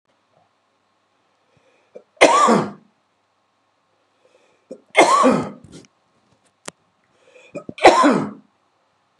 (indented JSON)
{
  "three_cough_length": "9.2 s",
  "three_cough_amplitude": 32768,
  "three_cough_signal_mean_std_ratio": 0.31,
  "survey_phase": "beta (2021-08-13 to 2022-03-07)",
  "age": "45-64",
  "gender": "Male",
  "wearing_mask": "No",
  "symptom_cough_any": true,
  "symptom_runny_or_blocked_nose": true,
  "symptom_shortness_of_breath": true,
  "symptom_sore_throat": true,
  "symptom_fatigue": true,
  "symptom_headache": true,
  "symptom_onset": "4 days",
  "smoker_status": "Ex-smoker",
  "respiratory_condition_asthma": false,
  "respiratory_condition_other": false,
  "recruitment_source": "Test and Trace",
  "submission_delay": "2 days",
  "covid_test_result": "Positive",
  "covid_test_method": "RT-qPCR",
  "covid_ct_value": 17.8,
  "covid_ct_gene": "ORF1ab gene",
  "covid_ct_mean": 18.2,
  "covid_viral_load": "1100000 copies/ml",
  "covid_viral_load_category": "High viral load (>1M copies/ml)"
}